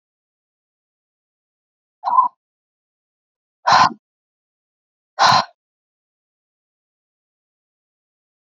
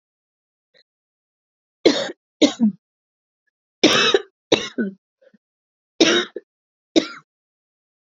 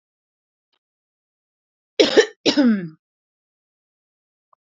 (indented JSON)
{
  "exhalation_length": "8.4 s",
  "exhalation_amplitude": 29740,
  "exhalation_signal_mean_std_ratio": 0.22,
  "three_cough_length": "8.1 s",
  "three_cough_amplitude": 32767,
  "three_cough_signal_mean_std_ratio": 0.31,
  "cough_length": "4.6 s",
  "cough_amplitude": 28557,
  "cough_signal_mean_std_ratio": 0.27,
  "survey_phase": "beta (2021-08-13 to 2022-03-07)",
  "age": "18-44",
  "gender": "Female",
  "wearing_mask": "No",
  "symptom_cough_any": true,
  "symptom_runny_or_blocked_nose": true,
  "symptom_sore_throat": true,
  "symptom_headache": true,
  "symptom_onset": "3 days",
  "smoker_status": "Never smoked",
  "respiratory_condition_asthma": false,
  "respiratory_condition_other": false,
  "recruitment_source": "Test and Trace",
  "submission_delay": "1 day",
  "covid_test_result": "Positive",
  "covid_test_method": "LAMP"
}